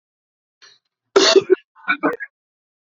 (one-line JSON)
{"cough_length": "3.0 s", "cough_amplitude": 28054, "cough_signal_mean_std_ratio": 0.32, "survey_phase": "beta (2021-08-13 to 2022-03-07)", "age": "18-44", "gender": "Male", "wearing_mask": "No", "symptom_cough_any": true, "symptom_new_continuous_cough": true, "symptom_runny_or_blocked_nose": true, "symptom_shortness_of_breath": true, "symptom_sore_throat": true, "symptom_fatigue": true, "symptom_headache": true, "symptom_change_to_sense_of_smell_or_taste": true, "symptom_loss_of_taste": true, "symptom_other": true, "smoker_status": "Ex-smoker", "respiratory_condition_asthma": false, "respiratory_condition_other": false, "recruitment_source": "Test and Trace", "submission_delay": "0 days", "covid_test_result": "Positive", "covid_test_method": "LFT"}